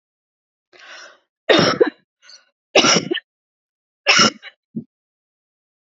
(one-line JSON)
{"three_cough_length": "6.0 s", "three_cough_amplitude": 32503, "three_cough_signal_mean_std_ratio": 0.32, "survey_phase": "beta (2021-08-13 to 2022-03-07)", "age": "45-64", "gender": "Female", "wearing_mask": "No", "symptom_cough_any": true, "symptom_onset": "12 days", "smoker_status": "Never smoked", "respiratory_condition_asthma": false, "respiratory_condition_other": false, "recruitment_source": "REACT", "submission_delay": "3 days", "covid_test_result": "Negative", "covid_test_method": "RT-qPCR", "influenza_a_test_result": "Negative", "influenza_b_test_result": "Negative"}